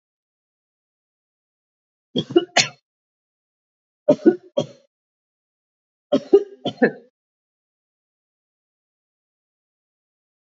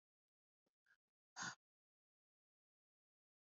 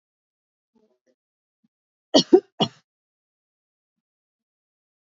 three_cough_length: 10.4 s
three_cough_amplitude: 28812
three_cough_signal_mean_std_ratio: 0.2
exhalation_length: 3.4 s
exhalation_amplitude: 522
exhalation_signal_mean_std_ratio: 0.18
cough_length: 5.1 s
cough_amplitude: 27487
cough_signal_mean_std_ratio: 0.15
survey_phase: beta (2021-08-13 to 2022-03-07)
age: 18-44
gender: Female
wearing_mask: 'No'
symptom_runny_or_blocked_nose: true
symptom_sore_throat: true
symptom_abdominal_pain: true
symptom_fatigue: true
symptom_headache: true
smoker_status: Ex-smoker
respiratory_condition_asthma: false
respiratory_condition_other: false
recruitment_source: Test and Trace
submission_delay: 1 day
covid_test_result: Positive
covid_test_method: RT-qPCR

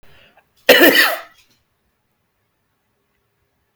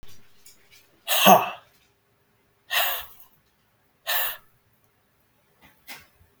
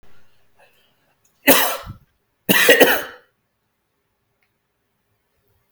cough_length: 3.8 s
cough_amplitude: 32768
cough_signal_mean_std_ratio: 0.28
exhalation_length: 6.4 s
exhalation_amplitude: 32766
exhalation_signal_mean_std_ratio: 0.29
three_cough_length: 5.7 s
three_cough_amplitude: 32768
three_cough_signal_mean_std_ratio: 0.3
survey_phase: beta (2021-08-13 to 2022-03-07)
age: 18-44
gender: Male
wearing_mask: 'No'
symptom_none: true
smoker_status: Never smoked
respiratory_condition_asthma: false
respiratory_condition_other: false
recruitment_source: REACT
submission_delay: 1 day
covid_test_result: Negative
covid_test_method: RT-qPCR
influenza_a_test_result: Negative
influenza_b_test_result: Negative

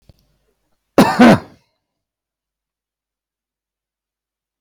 cough_length: 4.6 s
cough_amplitude: 32768
cough_signal_mean_std_ratio: 0.23
survey_phase: beta (2021-08-13 to 2022-03-07)
age: 65+
gender: Male
wearing_mask: 'No'
symptom_none: true
smoker_status: Never smoked
respiratory_condition_asthma: false
respiratory_condition_other: false
recruitment_source: REACT
submission_delay: 2 days
covid_test_result: Negative
covid_test_method: RT-qPCR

